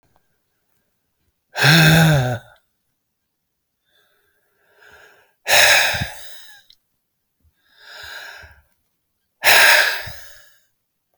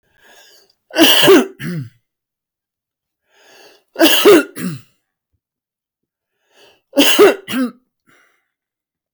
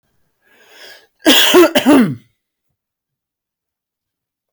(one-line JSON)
{"exhalation_length": "11.2 s", "exhalation_amplitude": 32768, "exhalation_signal_mean_std_ratio": 0.35, "three_cough_length": "9.1 s", "three_cough_amplitude": 32768, "three_cough_signal_mean_std_ratio": 0.36, "cough_length": "4.5 s", "cough_amplitude": 32768, "cough_signal_mean_std_ratio": 0.36, "survey_phase": "beta (2021-08-13 to 2022-03-07)", "age": "65+", "gender": "Male", "wearing_mask": "No", "symptom_fatigue": true, "symptom_headache": true, "symptom_onset": "12 days", "smoker_status": "Never smoked", "respiratory_condition_asthma": false, "respiratory_condition_other": false, "recruitment_source": "REACT", "submission_delay": "1 day", "covid_test_result": "Negative", "covid_test_method": "RT-qPCR"}